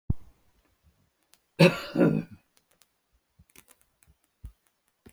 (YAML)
cough_length: 5.1 s
cough_amplitude: 18916
cough_signal_mean_std_ratio: 0.24
survey_phase: beta (2021-08-13 to 2022-03-07)
age: 65+
gender: Male
wearing_mask: 'No'
symptom_none: true
smoker_status: Never smoked
respiratory_condition_asthma: false
respiratory_condition_other: false
recruitment_source: REACT
submission_delay: 1 day
covid_test_result: Negative
covid_test_method: RT-qPCR
influenza_a_test_result: Negative
influenza_b_test_result: Negative